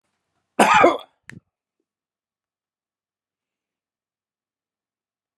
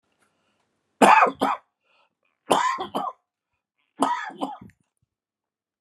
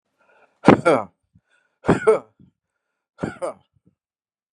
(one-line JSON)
{"cough_length": "5.4 s", "cough_amplitude": 30210, "cough_signal_mean_std_ratio": 0.21, "three_cough_length": "5.8 s", "three_cough_amplitude": 28610, "three_cough_signal_mean_std_ratio": 0.32, "exhalation_length": "4.5 s", "exhalation_amplitude": 32768, "exhalation_signal_mean_std_ratio": 0.27, "survey_phase": "beta (2021-08-13 to 2022-03-07)", "age": "65+", "gender": "Male", "wearing_mask": "No", "symptom_cough_any": true, "symptom_runny_or_blocked_nose": true, "symptom_sore_throat": true, "symptom_fatigue": true, "symptom_change_to_sense_of_smell_or_taste": true, "symptom_onset": "11 days", "smoker_status": "Ex-smoker", "respiratory_condition_asthma": false, "respiratory_condition_other": false, "recruitment_source": "REACT", "submission_delay": "-1 day", "covid_test_result": "Positive", "covid_test_method": "RT-qPCR", "covid_ct_value": 29.0, "covid_ct_gene": "E gene", "influenza_a_test_result": "Negative", "influenza_b_test_result": "Negative"}